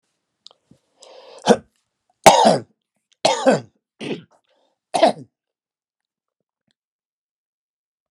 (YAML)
cough_length: 8.1 s
cough_amplitude: 32768
cough_signal_mean_std_ratio: 0.26
survey_phase: beta (2021-08-13 to 2022-03-07)
age: 45-64
gender: Male
wearing_mask: 'No'
symptom_runny_or_blocked_nose: true
symptom_headache: true
smoker_status: Never smoked
respiratory_condition_asthma: false
respiratory_condition_other: false
recruitment_source: Test and Trace
submission_delay: 1 day
covid_test_result: Positive
covid_test_method: LFT